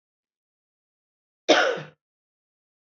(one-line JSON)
{"cough_length": "3.0 s", "cough_amplitude": 23664, "cough_signal_mean_std_ratio": 0.24, "survey_phase": "alpha (2021-03-01 to 2021-08-12)", "age": "45-64", "gender": "Female", "wearing_mask": "No", "symptom_none": true, "smoker_status": "Never smoked", "respiratory_condition_asthma": false, "respiratory_condition_other": false, "recruitment_source": "REACT", "submission_delay": "1 day", "covid_test_result": "Negative", "covid_test_method": "RT-qPCR"}